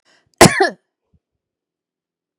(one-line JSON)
{"cough_length": "2.4 s", "cough_amplitude": 32768, "cough_signal_mean_std_ratio": 0.23, "survey_phase": "beta (2021-08-13 to 2022-03-07)", "age": "45-64", "gender": "Female", "wearing_mask": "No", "symptom_none": true, "smoker_status": "Never smoked", "respiratory_condition_asthma": false, "respiratory_condition_other": false, "recruitment_source": "REACT", "submission_delay": "4 days", "covid_test_result": "Negative", "covid_test_method": "RT-qPCR", "influenza_a_test_result": "Negative", "influenza_b_test_result": "Negative"}